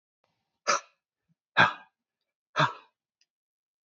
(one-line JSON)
{"exhalation_length": "3.8 s", "exhalation_amplitude": 16790, "exhalation_signal_mean_std_ratio": 0.24, "survey_phase": "beta (2021-08-13 to 2022-03-07)", "age": "18-44", "gender": "Male", "wearing_mask": "No", "symptom_runny_or_blocked_nose": true, "symptom_sore_throat": true, "symptom_fatigue": true, "symptom_onset": "2 days", "smoker_status": "Current smoker (1 to 10 cigarettes per day)", "respiratory_condition_asthma": false, "respiratory_condition_other": false, "recruitment_source": "REACT", "submission_delay": "-1 day", "covid_test_result": "Negative", "covid_test_method": "RT-qPCR", "influenza_a_test_result": "Negative", "influenza_b_test_result": "Negative"}